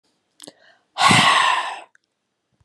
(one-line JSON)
{"exhalation_length": "2.6 s", "exhalation_amplitude": 28594, "exhalation_signal_mean_std_ratio": 0.44, "survey_phase": "beta (2021-08-13 to 2022-03-07)", "age": "45-64", "gender": "Female", "wearing_mask": "No", "symptom_none": true, "smoker_status": "Ex-smoker", "respiratory_condition_asthma": false, "respiratory_condition_other": false, "recruitment_source": "REACT", "submission_delay": "-5 days", "covid_test_result": "Negative", "covid_test_method": "RT-qPCR", "influenza_a_test_result": "Unknown/Void", "influenza_b_test_result": "Unknown/Void"}